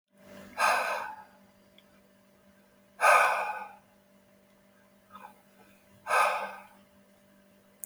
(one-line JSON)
{"exhalation_length": "7.9 s", "exhalation_amplitude": 10396, "exhalation_signal_mean_std_ratio": 0.36, "survey_phase": "beta (2021-08-13 to 2022-03-07)", "age": "65+", "gender": "Male", "wearing_mask": "No", "symptom_none": true, "symptom_onset": "4 days", "smoker_status": "Never smoked", "respiratory_condition_asthma": false, "respiratory_condition_other": false, "recruitment_source": "REACT", "submission_delay": "1 day", "covid_test_result": "Negative", "covid_test_method": "RT-qPCR", "influenza_a_test_result": "Negative", "influenza_b_test_result": "Negative"}